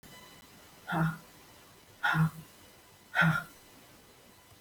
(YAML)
exhalation_length: 4.6 s
exhalation_amplitude: 6279
exhalation_signal_mean_std_ratio: 0.41
survey_phase: beta (2021-08-13 to 2022-03-07)
age: 65+
gender: Female
wearing_mask: 'No'
symptom_none: true
smoker_status: Ex-smoker
respiratory_condition_asthma: false
respiratory_condition_other: false
recruitment_source: Test and Trace
submission_delay: 0 days
covid_test_result: Negative
covid_test_method: LFT